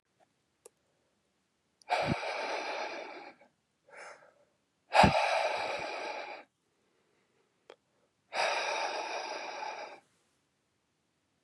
{
  "exhalation_length": "11.4 s",
  "exhalation_amplitude": 12202,
  "exhalation_signal_mean_std_ratio": 0.42,
  "survey_phase": "beta (2021-08-13 to 2022-03-07)",
  "age": "18-44",
  "gender": "Male",
  "wearing_mask": "No",
  "symptom_runny_or_blocked_nose": true,
  "symptom_loss_of_taste": true,
  "symptom_other": true,
  "smoker_status": "Never smoked",
  "respiratory_condition_asthma": false,
  "respiratory_condition_other": false,
  "recruitment_source": "Test and Trace",
  "submission_delay": "1 day",
  "covid_test_result": "Positive",
  "covid_test_method": "RT-qPCR",
  "covid_ct_value": 18.9,
  "covid_ct_gene": "ORF1ab gene"
}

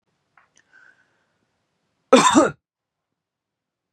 {
  "cough_length": "3.9 s",
  "cough_amplitude": 30238,
  "cough_signal_mean_std_ratio": 0.23,
  "survey_phase": "beta (2021-08-13 to 2022-03-07)",
  "age": "18-44",
  "gender": "Male",
  "wearing_mask": "No",
  "symptom_fever_high_temperature": true,
  "symptom_onset": "4 days",
  "smoker_status": "Never smoked",
  "respiratory_condition_asthma": false,
  "respiratory_condition_other": false,
  "recruitment_source": "Test and Trace",
  "submission_delay": "3 days",
  "covid_test_result": "Negative",
  "covid_test_method": "RT-qPCR"
}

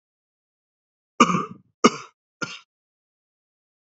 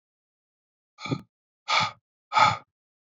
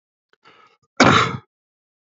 {
  "three_cough_length": "3.8 s",
  "three_cough_amplitude": 31298,
  "three_cough_signal_mean_std_ratio": 0.21,
  "exhalation_length": "3.2 s",
  "exhalation_amplitude": 15895,
  "exhalation_signal_mean_std_ratio": 0.31,
  "cough_length": "2.1 s",
  "cough_amplitude": 27985,
  "cough_signal_mean_std_ratio": 0.3,
  "survey_phase": "beta (2021-08-13 to 2022-03-07)",
  "age": "45-64",
  "gender": "Male",
  "wearing_mask": "No",
  "symptom_cough_any": true,
  "symptom_runny_or_blocked_nose": true,
  "symptom_fatigue": true,
  "symptom_headache": true,
  "smoker_status": "Never smoked",
  "respiratory_condition_asthma": false,
  "respiratory_condition_other": false,
  "recruitment_source": "Test and Trace",
  "submission_delay": "1 day",
  "covid_test_result": "Positive",
  "covid_test_method": "RT-qPCR",
  "covid_ct_value": 19.1,
  "covid_ct_gene": "ORF1ab gene",
  "covid_ct_mean": 19.8,
  "covid_viral_load": "320000 copies/ml",
  "covid_viral_load_category": "Low viral load (10K-1M copies/ml)"
}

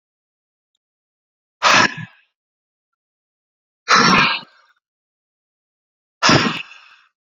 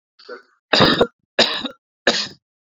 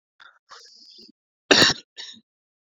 {
  "exhalation_length": "7.3 s",
  "exhalation_amplitude": 32768,
  "exhalation_signal_mean_std_ratio": 0.31,
  "three_cough_length": "2.7 s",
  "three_cough_amplitude": 31777,
  "three_cough_signal_mean_std_ratio": 0.41,
  "cough_length": "2.7 s",
  "cough_amplitude": 29913,
  "cough_signal_mean_std_ratio": 0.25,
  "survey_phase": "beta (2021-08-13 to 2022-03-07)",
  "age": "18-44",
  "gender": "Male",
  "wearing_mask": "No",
  "symptom_none": true,
  "smoker_status": "Ex-smoker",
  "respiratory_condition_asthma": false,
  "respiratory_condition_other": false,
  "recruitment_source": "REACT",
  "submission_delay": "0 days",
  "covid_test_result": "Negative",
  "covid_test_method": "RT-qPCR"
}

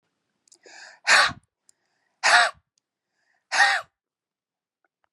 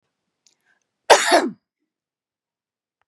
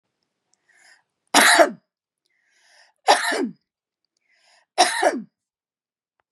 {
  "exhalation_length": "5.1 s",
  "exhalation_amplitude": 22150,
  "exhalation_signal_mean_std_ratio": 0.31,
  "cough_length": "3.1 s",
  "cough_amplitude": 32768,
  "cough_signal_mean_std_ratio": 0.24,
  "three_cough_length": "6.3 s",
  "three_cough_amplitude": 29911,
  "three_cough_signal_mean_std_ratio": 0.31,
  "survey_phase": "beta (2021-08-13 to 2022-03-07)",
  "age": "45-64",
  "gender": "Female",
  "wearing_mask": "No",
  "symptom_none": true,
  "smoker_status": "Never smoked",
  "respiratory_condition_asthma": false,
  "respiratory_condition_other": false,
  "recruitment_source": "REACT",
  "submission_delay": "2 days",
  "covid_test_result": "Negative",
  "covid_test_method": "RT-qPCR",
  "influenza_a_test_result": "Negative",
  "influenza_b_test_result": "Negative"
}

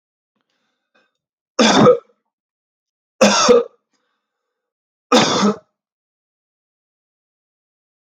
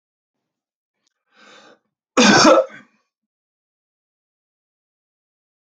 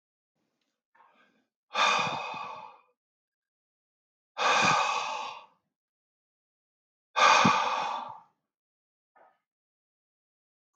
{
  "three_cough_length": "8.1 s",
  "three_cough_amplitude": 31590,
  "three_cough_signal_mean_std_ratio": 0.31,
  "cough_length": "5.6 s",
  "cough_amplitude": 32768,
  "cough_signal_mean_std_ratio": 0.24,
  "exhalation_length": "10.8 s",
  "exhalation_amplitude": 13047,
  "exhalation_signal_mean_std_ratio": 0.36,
  "survey_phase": "alpha (2021-03-01 to 2021-08-12)",
  "age": "45-64",
  "gender": "Male",
  "wearing_mask": "No",
  "symptom_none": true,
  "smoker_status": "Never smoked",
  "respiratory_condition_asthma": false,
  "respiratory_condition_other": false,
  "recruitment_source": "REACT",
  "submission_delay": "2 days",
  "covid_test_result": "Negative",
  "covid_test_method": "RT-qPCR"
}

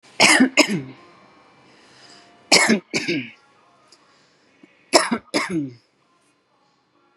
{
  "three_cough_length": "7.2 s",
  "three_cough_amplitude": 32767,
  "three_cough_signal_mean_std_ratio": 0.36,
  "survey_phase": "beta (2021-08-13 to 2022-03-07)",
  "age": "45-64",
  "gender": "Female",
  "wearing_mask": "No",
  "symptom_none": true,
  "smoker_status": "Never smoked",
  "respiratory_condition_asthma": false,
  "respiratory_condition_other": false,
  "recruitment_source": "REACT",
  "submission_delay": "2 days",
  "covid_test_result": "Negative",
  "covid_test_method": "RT-qPCR",
  "influenza_a_test_result": "Negative",
  "influenza_b_test_result": "Negative"
}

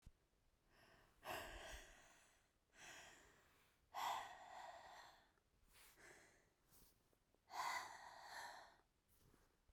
{
  "exhalation_length": "9.7 s",
  "exhalation_amplitude": 647,
  "exhalation_signal_mean_std_ratio": 0.49,
  "survey_phase": "beta (2021-08-13 to 2022-03-07)",
  "age": "18-44",
  "gender": "Female",
  "wearing_mask": "No",
  "symptom_runny_or_blocked_nose": true,
  "symptom_fatigue": true,
  "symptom_headache": true,
  "symptom_change_to_sense_of_smell_or_taste": true,
  "symptom_loss_of_taste": true,
  "smoker_status": "Never smoked",
  "respiratory_condition_asthma": true,
  "respiratory_condition_other": false,
  "recruitment_source": "Test and Trace",
  "submission_delay": "2 days",
  "covid_test_result": "Positive",
  "covid_test_method": "RT-qPCR",
  "covid_ct_value": 8.0,
  "covid_ct_gene": "N gene"
}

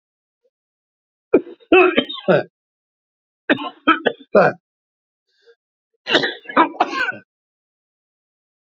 {
  "three_cough_length": "8.7 s",
  "three_cough_amplitude": 28686,
  "three_cough_signal_mean_std_ratio": 0.33,
  "survey_phase": "beta (2021-08-13 to 2022-03-07)",
  "age": "65+",
  "gender": "Male",
  "wearing_mask": "No",
  "symptom_none": true,
  "smoker_status": "Ex-smoker",
  "respiratory_condition_asthma": false,
  "respiratory_condition_other": false,
  "recruitment_source": "REACT",
  "submission_delay": "4 days",
  "covid_test_result": "Negative",
  "covid_test_method": "RT-qPCR",
  "influenza_a_test_result": "Negative",
  "influenza_b_test_result": "Positive",
  "influenza_b_ct_value": 34.5
}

